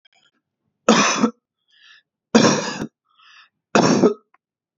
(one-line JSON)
{"three_cough_length": "4.8 s", "three_cough_amplitude": 30644, "three_cough_signal_mean_std_ratio": 0.39, "survey_phase": "beta (2021-08-13 to 2022-03-07)", "age": "18-44", "gender": "Male", "wearing_mask": "No", "symptom_none": true, "symptom_onset": "6 days", "smoker_status": "Never smoked", "respiratory_condition_asthma": false, "respiratory_condition_other": false, "recruitment_source": "REACT", "submission_delay": "3 days", "covid_test_result": "Negative", "covid_test_method": "RT-qPCR", "influenza_a_test_result": "Positive", "influenza_a_ct_value": 33.6, "influenza_b_test_result": "Negative"}